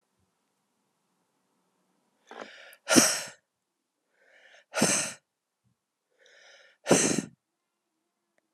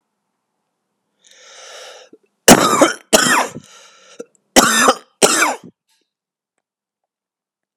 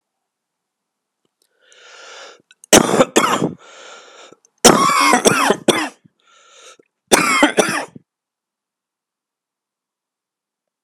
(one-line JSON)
{"exhalation_length": "8.5 s", "exhalation_amplitude": 20485, "exhalation_signal_mean_std_ratio": 0.26, "cough_length": "7.8 s", "cough_amplitude": 32768, "cough_signal_mean_std_ratio": 0.34, "three_cough_length": "10.8 s", "three_cough_amplitude": 32768, "three_cough_signal_mean_std_ratio": 0.35, "survey_phase": "beta (2021-08-13 to 2022-03-07)", "age": "18-44", "gender": "Male", "wearing_mask": "No", "symptom_cough_any": true, "symptom_runny_or_blocked_nose": true, "symptom_sore_throat": true, "symptom_fatigue": true, "symptom_onset": "3 days", "smoker_status": "Never smoked", "respiratory_condition_asthma": false, "respiratory_condition_other": false, "recruitment_source": "Test and Trace", "submission_delay": "1 day", "covid_test_result": "Positive", "covid_test_method": "RT-qPCR", "covid_ct_value": 18.6, "covid_ct_gene": "ORF1ab gene", "covid_ct_mean": 18.9, "covid_viral_load": "650000 copies/ml", "covid_viral_load_category": "Low viral load (10K-1M copies/ml)"}